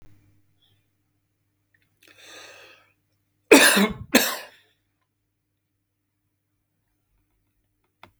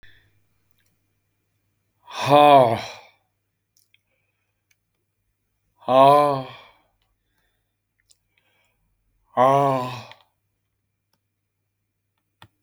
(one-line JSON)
{"cough_length": "8.2 s", "cough_amplitude": 32467, "cough_signal_mean_std_ratio": 0.21, "exhalation_length": "12.6 s", "exhalation_amplitude": 27969, "exhalation_signal_mean_std_ratio": 0.27, "survey_phase": "beta (2021-08-13 to 2022-03-07)", "age": "65+", "gender": "Male", "wearing_mask": "No", "symptom_none": true, "smoker_status": "Never smoked", "respiratory_condition_asthma": false, "respiratory_condition_other": false, "recruitment_source": "REACT", "submission_delay": "1 day", "covid_test_result": "Negative", "covid_test_method": "RT-qPCR"}